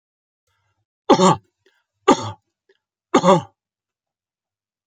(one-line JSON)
{"three_cough_length": "4.9 s", "three_cough_amplitude": 31407, "three_cough_signal_mean_std_ratio": 0.27, "survey_phase": "beta (2021-08-13 to 2022-03-07)", "age": "65+", "gender": "Male", "wearing_mask": "No", "symptom_runny_or_blocked_nose": true, "symptom_sore_throat": true, "smoker_status": "Never smoked", "respiratory_condition_asthma": false, "respiratory_condition_other": false, "recruitment_source": "REACT", "submission_delay": "2 days", "covid_test_result": "Negative", "covid_test_method": "RT-qPCR"}